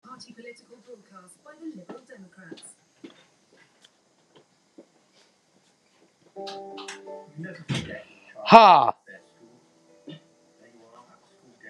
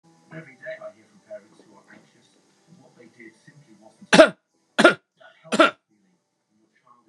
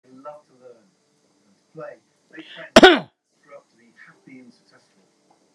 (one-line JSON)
{"exhalation_length": "11.7 s", "exhalation_amplitude": 32768, "exhalation_signal_mean_std_ratio": 0.2, "three_cough_length": "7.1 s", "three_cough_amplitude": 32767, "three_cough_signal_mean_std_ratio": 0.21, "cough_length": "5.5 s", "cough_amplitude": 32768, "cough_signal_mean_std_ratio": 0.18, "survey_phase": "beta (2021-08-13 to 2022-03-07)", "age": "65+", "gender": "Male", "wearing_mask": "No", "symptom_none": true, "smoker_status": "Never smoked", "respiratory_condition_asthma": false, "respiratory_condition_other": false, "recruitment_source": "REACT", "submission_delay": "2 days", "covid_test_result": "Negative", "covid_test_method": "RT-qPCR"}